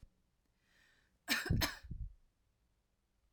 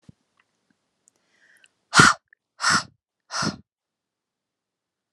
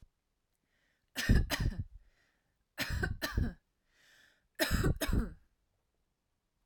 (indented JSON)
{
  "cough_length": "3.3 s",
  "cough_amplitude": 2880,
  "cough_signal_mean_std_ratio": 0.33,
  "exhalation_length": "5.1 s",
  "exhalation_amplitude": 32767,
  "exhalation_signal_mean_std_ratio": 0.23,
  "three_cough_length": "6.7 s",
  "three_cough_amplitude": 6169,
  "three_cough_signal_mean_std_ratio": 0.41,
  "survey_phase": "alpha (2021-03-01 to 2021-08-12)",
  "age": "18-44",
  "gender": "Female",
  "wearing_mask": "No",
  "symptom_none": true,
  "smoker_status": "Never smoked",
  "respiratory_condition_asthma": false,
  "respiratory_condition_other": false,
  "recruitment_source": "REACT",
  "submission_delay": "2 days",
  "covid_test_result": "Negative",
  "covid_test_method": "RT-qPCR"
}